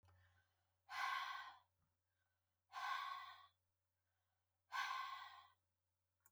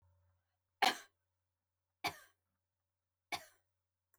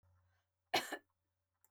{"exhalation_length": "6.3 s", "exhalation_amplitude": 861, "exhalation_signal_mean_std_ratio": 0.45, "three_cough_length": "4.2 s", "three_cough_amplitude": 3951, "three_cough_signal_mean_std_ratio": 0.18, "cough_length": "1.7 s", "cough_amplitude": 2506, "cough_signal_mean_std_ratio": 0.24, "survey_phase": "beta (2021-08-13 to 2022-03-07)", "age": "65+", "gender": "Female", "wearing_mask": "No", "symptom_none": true, "smoker_status": "Never smoked", "respiratory_condition_asthma": false, "respiratory_condition_other": false, "recruitment_source": "Test and Trace", "submission_delay": "1 day", "covid_test_result": "Negative", "covid_test_method": "RT-qPCR"}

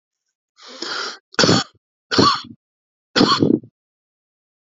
{"three_cough_length": "4.8 s", "three_cough_amplitude": 32768, "three_cough_signal_mean_std_ratio": 0.38, "survey_phase": "alpha (2021-03-01 to 2021-08-12)", "age": "45-64", "gender": "Male", "wearing_mask": "No", "symptom_none": true, "smoker_status": "Current smoker (11 or more cigarettes per day)", "respiratory_condition_asthma": false, "respiratory_condition_other": false, "recruitment_source": "REACT", "submission_delay": "2 days", "covid_test_result": "Negative", "covid_test_method": "RT-qPCR"}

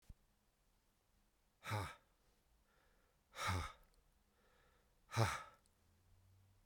{"exhalation_length": "6.7 s", "exhalation_amplitude": 2744, "exhalation_signal_mean_std_ratio": 0.31, "survey_phase": "beta (2021-08-13 to 2022-03-07)", "age": "65+", "gender": "Male", "wearing_mask": "No", "symptom_cough_any": true, "symptom_runny_or_blocked_nose": true, "symptom_sore_throat": true, "symptom_fatigue": true, "symptom_headache": true, "symptom_onset": "5 days", "smoker_status": "Never smoked", "respiratory_condition_asthma": false, "respiratory_condition_other": false, "recruitment_source": "Test and Trace", "submission_delay": "2 days", "covid_test_result": "Positive", "covid_test_method": "RT-qPCR", "covid_ct_value": 16.0, "covid_ct_gene": "ORF1ab gene", "covid_ct_mean": 16.3, "covid_viral_load": "4600000 copies/ml", "covid_viral_load_category": "High viral load (>1M copies/ml)"}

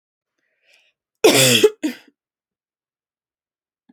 {"cough_length": "3.9 s", "cough_amplitude": 29629, "cough_signal_mean_std_ratio": 0.29, "survey_phase": "alpha (2021-03-01 to 2021-08-12)", "age": "18-44", "gender": "Female", "wearing_mask": "No", "symptom_none": true, "smoker_status": "Never smoked", "respiratory_condition_asthma": false, "respiratory_condition_other": false, "recruitment_source": "REACT", "submission_delay": "1 day", "covid_test_result": "Negative", "covid_test_method": "RT-qPCR"}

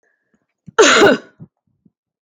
{"cough_length": "2.2 s", "cough_amplitude": 32768, "cough_signal_mean_std_ratio": 0.36, "survey_phase": "beta (2021-08-13 to 2022-03-07)", "age": "45-64", "gender": "Female", "wearing_mask": "No", "symptom_change_to_sense_of_smell_or_taste": true, "symptom_loss_of_taste": true, "symptom_onset": "12 days", "smoker_status": "Never smoked", "respiratory_condition_asthma": false, "respiratory_condition_other": false, "recruitment_source": "REACT", "submission_delay": "1 day", "covid_test_result": "Negative", "covid_test_method": "RT-qPCR", "influenza_a_test_result": "Negative", "influenza_b_test_result": "Negative"}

